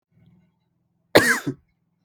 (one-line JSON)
{"cough_length": "2.0 s", "cough_amplitude": 32768, "cough_signal_mean_std_ratio": 0.27, "survey_phase": "alpha (2021-03-01 to 2021-08-12)", "age": "18-44", "gender": "Male", "wearing_mask": "No", "symptom_cough_any": true, "symptom_new_continuous_cough": true, "symptom_fever_high_temperature": true, "symptom_change_to_sense_of_smell_or_taste": true, "smoker_status": "Never smoked", "respiratory_condition_asthma": false, "respiratory_condition_other": false, "recruitment_source": "Test and Trace", "submission_delay": "2 days", "covid_test_result": "Positive", "covid_test_method": "RT-qPCR", "covid_ct_value": 18.4, "covid_ct_gene": "ORF1ab gene"}